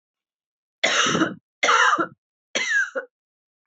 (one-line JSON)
{"three_cough_length": "3.7 s", "three_cough_amplitude": 19311, "three_cough_signal_mean_std_ratio": 0.5, "survey_phase": "alpha (2021-03-01 to 2021-08-12)", "age": "18-44", "gender": "Female", "wearing_mask": "No", "symptom_cough_any": true, "symptom_shortness_of_breath": true, "symptom_fatigue": true, "symptom_headache": true, "symptom_change_to_sense_of_smell_or_taste": true, "symptom_loss_of_taste": true, "symptom_onset": "5 days", "smoker_status": "Ex-smoker", "respiratory_condition_asthma": false, "respiratory_condition_other": false, "recruitment_source": "Test and Trace", "submission_delay": "2 days", "covid_test_result": "Positive", "covid_test_method": "RT-qPCR", "covid_ct_value": 21.3, "covid_ct_gene": "E gene"}